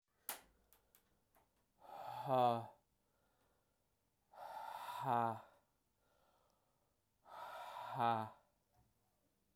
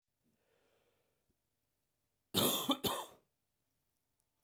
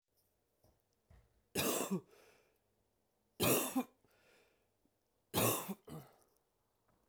exhalation_length: 9.6 s
exhalation_amplitude: 2310
exhalation_signal_mean_std_ratio: 0.35
cough_length: 4.4 s
cough_amplitude: 3861
cough_signal_mean_std_ratio: 0.28
three_cough_length: 7.1 s
three_cough_amplitude: 3709
three_cough_signal_mean_std_ratio: 0.34
survey_phase: beta (2021-08-13 to 2022-03-07)
age: 18-44
gender: Male
wearing_mask: 'No'
symptom_cough_any: true
symptom_runny_or_blocked_nose: true
symptom_loss_of_taste: true
symptom_onset: 3 days
smoker_status: Never smoked
respiratory_condition_asthma: false
respiratory_condition_other: false
recruitment_source: Test and Trace
submission_delay: 2 days
covid_test_result: Positive
covid_test_method: RT-qPCR
covid_ct_value: 20.5
covid_ct_gene: N gene
covid_ct_mean: 21.5
covid_viral_load: 86000 copies/ml
covid_viral_load_category: Low viral load (10K-1M copies/ml)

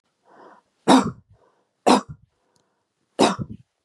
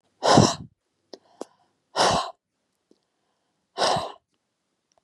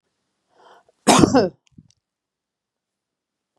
three_cough_length: 3.8 s
three_cough_amplitude: 27446
three_cough_signal_mean_std_ratio: 0.3
exhalation_length: 5.0 s
exhalation_amplitude: 24651
exhalation_signal_mean_std_ratio: 0.32
cough_length: 3.6 s
cough_amplitude: 32768
cough_signal_mean_std_ratio: 0.25
survey_phase: beta (2021-08-13 to 2022-03-07)
age: 45-64
gender: Female
wearing_mask: 'No'
symptom_none: true
smoker_status: Ex-smoker
respiratory_condition_asthma: false
respiratory_condition_other: false
recruitment_source: REACT
submission_delay: 2 days
covid_test_result: Negative
covid_test_method: RT-qPCR
influenza_a_test_result: Negative
influenza_b_test_result: Negative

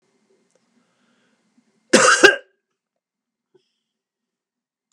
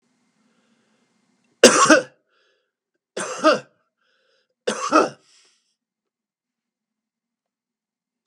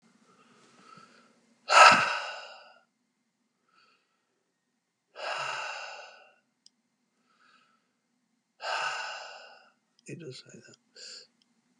cough_length: 4.9 s
cough_amplitude: 32768
cough_signal_mean_std_ratio: 0.21
three_cough_length: 8.3 s
three_cough_amplitude: 32768
three_cough_signal_mean_std_ratio: 0.24
exhalation_length: 11.8 s
exhalation_amplitude: 22296
exhalation_signal_mean_std_ratio: 0.23
survey_phase: beta (2021-08-13 to 2022-03-07)
age: 65+
gender: Male
wearing_mask: 'No'
symptom_none: true
smoker_status: Never smoked
respiratory_condition_asthma: false
respiratory_condition_other: false
recruitment_source: REACT
submission_delay: 1 day
covid_test_result: Negative
covid_test_method: RT-qPCR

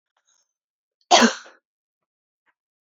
cough_length: 3.0 s
cough_amplitude: 27618
cough_signal_mean_std_ratio: 0.21
survey_phase: beta (2021-08-13 to 2022-03-07)
age: 18-44
gender: Female
wearing_mask: 'No'
symptom_none: true
smoker_status: Never smoked
respiratory_condition_asthma: false
respiratory_condition_other: false
recruitment_source: REACT
submission_delay: 1 day
covid_test_result: Negative
covid_test_method: RT-qPCR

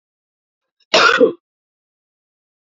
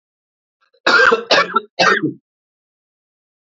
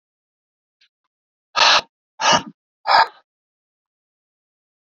cough_length: 2.7 s
cough_amplitude: 32768
cough_signal_mean_std_ratio: 0.29
three_cough_length: 3.5 s
three_cough_amplitude: 32768
three_cough_signal_mean_std_ratio: 0.4
exhalation_length: 4.9 s
exhalation_amplitude: 27997
exhalation_signal_mean_std_ratio: 0.28
survey_phase: beta (2021-08-13 to 2022-03-07)
age: 18-44
gender: Male
wearing_mask: 'No'
symptom_cough_any: true
symptom_runny_or_blocked_nose: true
symptom_sore_throat: true
symptom_fatigue: true
symptom_headache: true
smoker_status: Current smoker (e-cigarettes or vapes only)
recruitment_source: Test and Trace
submission_delay: 0 days
covid_test_result: Positive
covid_test_method: LFT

